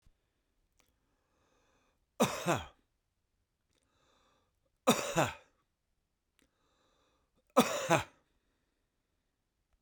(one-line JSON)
{"three_cough_length": "9.8 s", "three_cough_amplitude": 8794, "three_cough_signal_mean_std_ratio": 0.24, "survey_phase": "beta (2021-08-13 to 2022-03-07)", "age": "65+", "gender": "Male", "wearing_mask": "No", "symptom_runny_or_blocked_nose": true, "symptom_sore_throat": true, "smoker_status": "Ex-smoker", "respiratory_condition_asthma": false, "respiratory_condition_other": true, "recruitment_source": "REACT", "submission_delay": "2 days", "covid_test_result": "Negative", "covid_test_method": "RT-qPCR", "influenza_a_test_result": "Negative", "influenza_b_test_result": "Negative"}